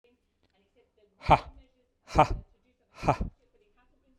{"exhalation_length": "4.2 s", "exhalation_amplitude": 15709, "exhalation_signal_mean_std_ratio": 0.25, "survey_phase": "beta (2021-08-13 to 2022-03-07)", "age": "45-64", "gender": "Male", "wearing_mask": "No", "symptom_cough_any": true, "smoker_status": "Never smoked", "respiratory_condition_asthma": false, "respiratory_condition_other": false, "recruitment_source": "REACT", "submission_delay": "0 days", "covid_test_result": "Negative", "covid_test_method": "RT-qPCR"}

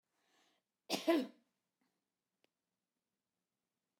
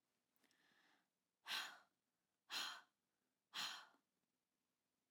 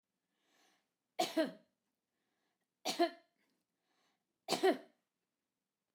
{"cough_length": "4.0 s", "cough_amplitude": 2817, "cough_signal_mean_std_ratio": 0.21, "exhalation_length": "5.1 s", "exhalation_amplitude": 624, "exhalation_signal_mean_std_ratio": 0.33, "three_cough_length": "5.9 s", "three_cough_amplitude": 3343, "three_cough_signal_mean_std_ratio": 0.26, "survey_phase": "beta (2021-08-13 to 2022-03-07)", "age": "45-64", "gender": "Female", "wearing_mask": "No", "symptom_none": true, "smoker_status": "Never smoked", "respiratory_condition_asthma": false, "respiratory_condition_other": false, "recruitment_source": "REACT", "submission_delay": "2 days", "covid_test_result": "Negative", "covid_test_method": "RT-qPCR", "influenza_a_test_result": "Negative", "influenza_b_test_result": "Negative"}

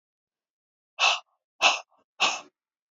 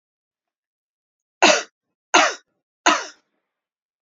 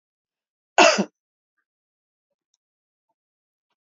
{"exhalation_length": "2.9 s", "exhalation_amplitude": 16736, "exhalation_signal_mean_std_ratio": 0.32, "three_cough_length": "4.0 s", "three_cough_amplitude": 30487, "three_cough_signal_mean_std_ratio": 0.27, "cough_length": "3.8 s", "cough_amplitude": 29082, "cough_signal_mean_std_ratio": 0.19, "survey_phase": "alpha (2021-03-01 to 2021-08-12)", "age": "45-64", "gender": "Female", "wearing_mask": "No", "symptom_none": true, "smoker_status": "Never smoked", "respiratory_condition_asthma": false, "respiratory_condition_other": false, "recruitment_source": "REACT", "submission_delay": "1 day", "covid_test_result": "Negative", "covid_test_method": "RT-qPCR"}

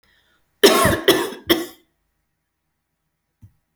{"three_cough_length": "3.8 s", "three_cough_amplitude": 30662, "three_cough_signal_mean_std_ratio": 0.33, "survey_phase": "alpha (2021-03-01 to 2021-08-12)", "age": "45-64", "gender": "Female", "wearing_mask": "No", "symptom_none": true, "smoker_status": "Never smoked", "respiratory_condition_asthma": false, "respiratory_condition_other": false, "recruitment_source": "REACT", "submission_delay": "1 day", "covid_test_result": "Negative", "covid_test_method": "RT-qPCR"}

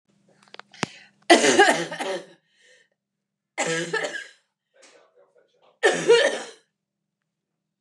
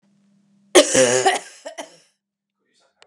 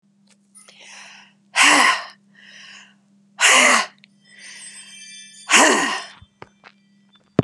{"three_cough_length": "7.8 s", "three_cough_amplitude": 29281, "three_cough_signal_mean_std_ratio": 0.35, "cough_length": "3.1 s", "cough_amplitude": 32767, "cough_signal_mean_std_ratio": 0.35, "exhalation_length": "7.4 s", "exhalation_amplitude": 31849, "exhalation_signal_mean_std_ratio": 0.38, "survey_phase": "beta (2021-08-13 to 2022-03-07)", "age": "45-64", "gender": "Female", "wearing_mask": "No", "symptom_none": true, "smoker_status": "Current smoker (1 to 10 cigarettes per day)", "respiratory_condition_asthma": false, "respiratory_condition_other": false, "recruitment_source": "REACT", "submission_delay": "1 day", "covid_test_result": "Negative", "covid_test_method": "RT-qPCR", "influenza_a_test_result": "Unknown/Void", "influenza_b_test_result": "Unknown/Void"}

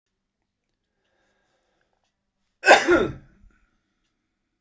{"cough_length": "4.6 s", "cough_amplitude": 30442, "cough_signal_mean_std_ratio": 0.22, "survey_phase": "beta (2021-08-13 to 2022-03-07)", "age": "65+", "gender": "Male", "wearing_mask": "No", "symptom_cough_any": true, "symptom_runny_or_blocked_nose": true, "symptom_fatigue": true, "symptom_other": true, "symptom_onset": "3 days", "smoker_status": "Never smoked", "respiratory_condition_asthma": false, "respiratory_condition_other": false, "recruitment_source": "Test and Trace", "submission_delay": "2 days", "covid_test_result": "Positive", "covid_test_method": "LAMP"}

